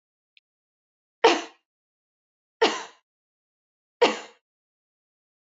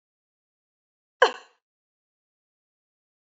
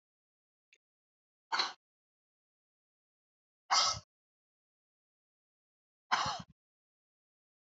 {"three_cough_length": "5.5 s", "three_cough_amplitude": 21896, "three_cough_signal_mean_std_ratio": 0.21, "cough_length": "3.2 s", "cough_amplitude": 22656, "cough_signal_mean_std_ratio": 0.12, "exhalation_length": "7.7 s", "exhalation_amplitude": 5122, "exhalation_signal_mean_std_ratio": 0.23, "survey_phase": "beta (2021-08-13 to 2022-03-07)", "age": "45-64", "gender": "Female", "wearing_mask": "No", "symptom_none": true, "smoker_status": "Ex-smoker", "respiratory_condition_asthma": false, "respiratory_condition_other": false, "recruitment_source": "REACT", "submission_delay": "3 days", "covid_test_result": "Negative", "covid_test_method": "RT-qPCR", "influenza_a_test_result": "Negative", "influenza_b_test_result": "Negative"}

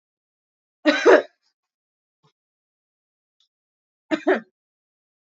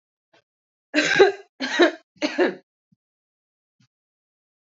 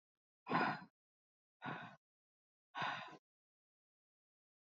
{"cough_length": "5.2 s", "cough_amplitude": 27278, "cough_signal_mean_std_ratio": 0.22, "three_cough_length": "4.7 s", "three_cough_amplitude": 27758, "three_cough_signal_mean_std_ratio": 0.32, "exhalation_length": "4.6 s", "exhalation_amplitude": 2492, "exhalation_signal_mean_std_ratio": 0.32, "survey_phase": "alpha (2021-03-01 to 2021-08-12)", "age": "18-44", "gender": "Female", "wearing_mask": "No", "symptom_none": true, "symptom_onset": "13 days", "smoker_status": "Current smoker (11 or more cigarettes per day)", "respiratory_condition_asthma": false, "respiratory_condition_other": false, "recruitment_source": "REACT", "submission_delay": "1 day", "covid_test_result": "Negative", "covid_test_method": "RT-qPCR"}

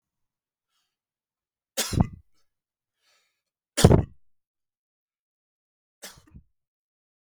{"three_cough_length": "7.3 s", "three_cough_amplitude": 32768, "three_cough_signal_mean_std_ratio": 0.17, "survey_phase": "beta (2021-08-13 to 2022-03-07)", "age": "45-64", "gender": "Male", "wearing_mask": "No", "symptom_none": true, "smoker_status": "Never smoked", "respiratory_condition_asthma": true, "respiratory_condition_other": false, "recruitment_source": "REACT", "submission_delay": "7 days", "covid_test_result": "Negative", "covid_test_method": "RT-qPCR", "influenza_a_test_result": "Negative", "influenza_b_test_result": "Negative"}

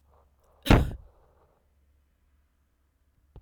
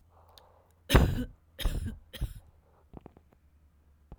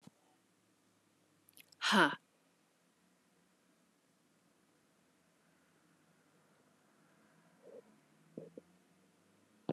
{"cough_length": "3.4 s", "cough_amplitude": 21238, "cough_signal_mean_std_ratio": 0.2, "three_cough_length": "4.2 s", "three_cough_amplitude": 20730, "three_cough_signal_mean_std_ratio": 0.32, "exhalation_length": "9.7 s", "exhalation_amplitude": 6717, "exhalation_signal_mean_std_ratio": 0.18, "survey_phase": "alpha (2021-03-01 to 2021-08-12)", "age": "45-64", "gender": "Female", "wearing_mask": "No", "symptom_none": true, "smoker_status": "Never smoked", "respiratory_condition_asthma": false, "respiratory_condition_other": false, "recruitment_source": "REACT", "submission_delay": "2 days", "covid_test_result": "Negative", "covid_test_method": "RT-qPCR"}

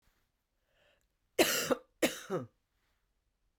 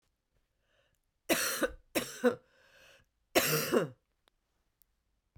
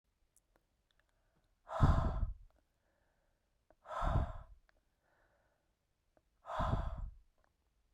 {"cough_length": "3.6 s", "cough_amplitude": 8388, "cough_signal_mean_std_ratio": 0.3, "three_cough_length": "5.4 s", "three_cough_amplitude": 11407, "three_cough_signal_mean_std_ratio": 0.36, "exhalation_length": "7.9 s", "exhalation_amplitude": 4565, "exhalation_signal_mean_std_ratio": 0.35, "survey_phase": "beta (2021-08-13 to 2022-03-07)", "age": "45-64", "gender": "Female", "wearing_mask": "No", "symptom_cough_any": true, "symptom_runny_or_blocked_nose": true, "symptom_sore_throat": true, "symptom_fever_high_temperature": true, "symptom_change_to_sense_of_smell_or_taste": true, "symptom_loss_of_taste": true, "smoker_status": "Never smoked", "respiratory_condition_asthma": false, "respiratory_condition_other": false, "recruitment_source": "Test and Trace", "submission_delay": "2 days", "covid_test_result": "Positive", "covid_test_method": "LFT"}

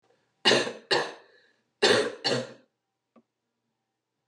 {"cough_length": "4.3 s", "cough_amplitude": 15007, "cough_signal_mean_std_ratio": 0.36, "survey_phase": "beta (2021-08-13 to 2022-03-07)", "age": "45-64", "gender": "Female", "wearing_mask": "No", "symptom_cough_any": true, "symptom_runny_or_blocked_nose": true, "symptom_sore_throat": true, "symptom_fatigue": true, "symptom_headache": true, "symptom_onset": "3 days", "smoker_status": "Ex-smoker", "respiratory_condition_asthma": false, "respiratory_condition_other": false, "recruitment_source": "Test and Trace", "submission_delay": "1 day", "covid_test_result": "Positive", "covid_test_method": "RT-qPCR", "covid_ct_value": 13.9, "covid_ct_gene": "ORF1ab gene"}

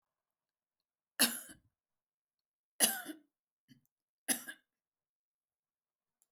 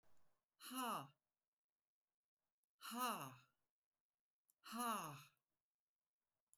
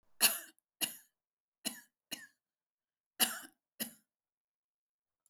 {"three_cough_length": "6.3 s", "three_cough_amplitude": 8501, "three_cough_signal_mean_std_ratio": 0.2, "exhalation_length": "6.6 s", "exhalation_amplitude": 882, "exhalation_signal_mean_std_ratio": 0.37, "cough_length": "5.3 s", "cough_amplitude": 7050, "cough_signal_mean_std_ratio": 0.23, "survey_phase": "beta (2021-08-13 to 2022-03-07)", "age": "65+", "gender": "Female", "wearing_mask": "No", "symptom_none": true, "smoker_status": "Never smoked", "recruitment_source": "REACT", "submission_delay": "4 days", "covid_test_result": "Negative", "covid_test_method": "RT-qPCR"}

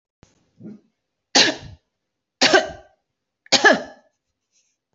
{"three_cough_length": "4.9 s", "three_cough_amplitude": 30430, "three_cough_signal_mean_std_ratio": 0.29, "survey_phase": "beta (2021-08-13 to 2022-03-07)", "age": "45-64", "gender": "Female", "wearing_mask": "No", "symptom_runny_or_blocked_nose": true, "symptom_diarrhoea": true, "symptom_fatigue": true, "smoker_status": "Never smoked", "respiratory_condition_asthma": false, "respiratory_condition_other": false, "recruitment_source": "Test and Trace", "submission_delay": "2 days", "covid_test_result": "Positive", "covid_test_method": "RT-qPCR", "covid_ct_value": 19.2, "covid_ct_gene": "ORF1ab gene"}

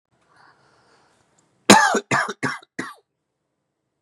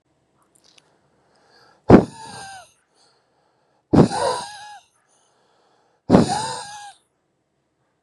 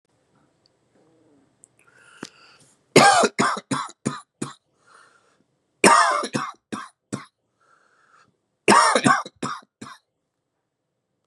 {"cough_length": "4.0 s", "cough_amplitude": 32768, "cough_signal_mean_std_ratio": 0.28, "exhalation_length": "8.0 s", "exhalation_amplitude": 32768, "exhalation_signal_mean_std_ratio": 0.26, "three_cough_length": "11.3 s", "three_cough_amplitude": 32767, "three_cough_signal_mean_std_ratio": 0.32, "survey_phase": "beta (2021-08-13 to 2022-03-07)", "age": "18-44", "gender": "Male", "wearing_mask": "No", "symptom_cough_any": true, "symptom_headache": true, "smoker_status": "Current smoker (e-cigarettes or vapes only)", "respiratory_condition_asthma": false, "respiratory_condition_other": false, "recruitment_source": "Test and Trace", "submission_delay": "1 day", "covid_test_result": "Positive", "covid_test_method": "RT-qPCR", "covid_ct_value": 32.0, "covid_ct_gene": "ORF1ab gene"}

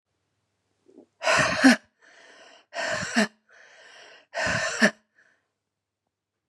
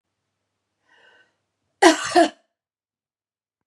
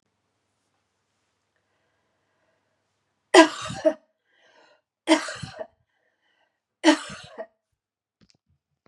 {"exhalation_length": "6.5 s", "exhalation_amplitude": 22202, "exhalation_signal_mean_std_ratio": 0.35, "cough_length": "3.7 s", "cough_amplitude": 32768, "cough_signal_mean_std_ratio": 0.23, "three_cough_length": "8.9 s", "three_cough_amplitude": 30723, "three_cough_signal_mean_std_ratio": 0.2, "survey_phase": "beta (2021-08-13 to 2022-03-07)", "age": "18-44", "gender": "Female", "wearing_mask": "No", "symptom_cough_any": true, "smoker_status": "Current smoker (1 to 10 cigarettes per day)", "respiratory_condition_asthma": false, "respiratory_condition_other": false, "recruitment_source": "Test and Trace", "submission_delay": "1 day", "covid_test_result": "Positive", "covid_test_method": "RT-qPCR", "covid_ct_value": 32.9, "covid_ct_gene": "ORF1ab gene", "covid_ct_mean": 33.1, "covid_viral_load": "14 copies/ml", "covid_viral_load_category": "Minimal viral load (< 10K copies/ml)"}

